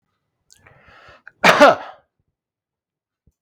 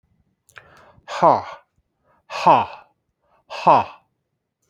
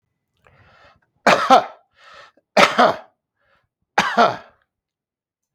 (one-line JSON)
{"cough_length": "3.4 s", "cough_amplitude": 32768, "cough_signal_mean_std_ratio": 0.25, "exhalation_length": "4.7 s", "exhalation_amplitude": 27261, "exhalation_signal_mean_std_ratio": 0.3, "three_cough_length": "5.5 s", "three_cough_amplitude": 32768, "three_cough_signal_mean_std_ratio": 0.32, "survey_phase": "beta (2021-08-13 to 2022-03-07)", "age": "65+", "gender": "Male", "wearing_mask": "No", "symptom_none": true, "smoker_status": "Current smoker (e-cigarettes or vapes only)", "respiratory_condition_asthma": false, "respiratory_condition_other": false, "recruitment_source": "Test and Trace", "submission_delay": "0 days", "covid_test_result": "Negative", "covid_test_method": "LFT"}